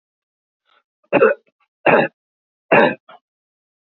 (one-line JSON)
{"three_cough_length": "3.8 s", "three_cough_amplitude": 30866, "three_cough_signal_mean_std_ratio": 0.32, "survey_phase": "beta (2021-08-13 to 2022-03-07)", "age": "45-64", "gender": "Male", "wearing_mask": "No", "symptom_none": true, "smoker_status": "Never smoked", "respiratory_condition_asthma": false, "respiratory_condition_other": false, "recruitment_source": "REACT", "submission_delay": "3 days", "covid_test_result": "Negative", "covid_test_method": "RT-qPCR", "influenza_a_test_result": "Negative", "influenza_b_test_result": "Negative"}